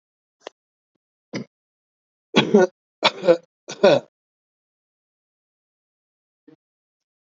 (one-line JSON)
{"three_cough_length": "7.3 s", "three_cough_amplitude": 28121, "three_cough_signal_mean_std_ratio": 0.23, "survey_phase": "alpha (2021-03-01 to 2021-08-12)", "age": "45-64", "gender": "Male", "wearing_mask": "No", "symptom_none": true, "smoker_status": "Ex-smoker", "recruitment_source": "REACT", "submission_delay": "1 day", "covid_test_result": "Negative", "covid_test_method": "RT-qPCR"}